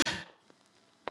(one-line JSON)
{"cough_length": "1.1 s", "cough_amplitude": 7584, "cough_signal_mean_std_ratio": 0.32, "survey_phase": "beta (2021-08-13 to 2022-03-07)", "age": "18-44", "gender": "Female", "wearing_mask": "No", "symptom_runny_or_blocked_nose": true, "symptom_fatigue": true, "symptom_headache": true, "symptom_change_to_sense_of_smell_or_taste": true, "symptom_onset": "3 days", "smoker_status": "Never smoked", "respiratory_condition_asthma": false, "respiratory_condition_other": false, "recruitment_source": "Test and Trace", "submission_delay": "2 days", "covid_test_result": "Positive", "covid_test_method": "RT-qPCR", "covid_ct_value": 21.7, "covid_ct_gene": "N gene"}